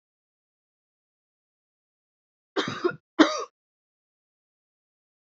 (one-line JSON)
{"cough_length": "5.4 s", "cough_amplitude": 25076, "cough_signal_mean_std_ratio": 0.19, "survey_phase": "beta (2021-08-13 to 2022-03-07)", "age": "18-44", "gender": "Female", "wearing_mask": "No", "symptom_cough_any": true, "symptom_runny_or_blocked_nose": true, "symptom_fatigue": true, "symptom_onset": "2 days", "smoker_status": "Never smoked", "respiratory_condition_asthma": false, "respiratory_condition_other": false, "recruitment_source": "Test and Trace", "submission_delay": "2 days", "covid_test_result": "Positive", "covid_test_method": "RT-qPCR", "covid_ct_value": 18.2, "covid_ct_gene": "ORF1ab gene", "covid_ct_mean": 19.4, "covid_viral_load": "440000 copies/ml", "covid_viral_load_category": "Low viral load (10K-1M copies/ml)"}